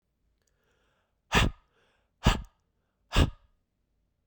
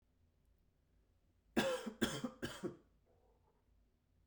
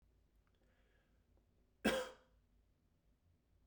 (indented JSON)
{
  "exhalation_length": "4.3 s",
  "exhalation_amplitude": 12772,
  "exhalation_signal_mean_std_ratio": 0.26,
  "three_cough_length": "4.3 s",
  "three_cough_amplitude": 3272,
  "three_cough_signal_mean_std_ratio": 0.35,
  "cough_length": "3.7 s",
  "cough_amplitude": 2827,
  "cough_signal_mean_std_ratio": 0.23,
  "survey_phase": "beta (2021-08-13 to 2022-03-07)",
  "age": "18-44",
  "gender": "Male",
  "wearing_mask": "No",
  "symptom_cough_any": true,
  "symptom_runny_or_blocked_nose": true,
  "smoker_status": "Never smoked",
  "respiratory_condition_asthma": false,
  "respiratory_condition_other": false,
  "recruitment_source": "Test and Trace",
  "submission_delay": "1 day",
  "covid_test_result": "Positive",
  "covid_test_method": "RT-qPCR",
  "covid_ct_value": 24.0,
  "covid_ct_gene": "ORF1ab gene"
}